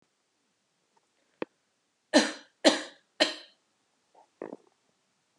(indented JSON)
{
  "three_cough_length": "5.4 s",
  "three_cough_amplitude": 22842,
  "three_cough_signal_mean_std_ratio": 0.21,
  "survey_phase": "beta (2021-08-13 to 2022-03-07)",
  "age": "18-44",
  "gender": "Female",
  "wearing_mask": "No",
  "symptom_abdominal_pain": true,
  "smoker_status": "Never smoked",
  "respiratory_condition_asthma": false,
  "respiratory_condition_other": false,
  "recruitment_source": "REACT",
  "submission_delay": "2 days",
  "covid_test_result": "Negative",
  "covid_test_method": "RT-qPCR"
}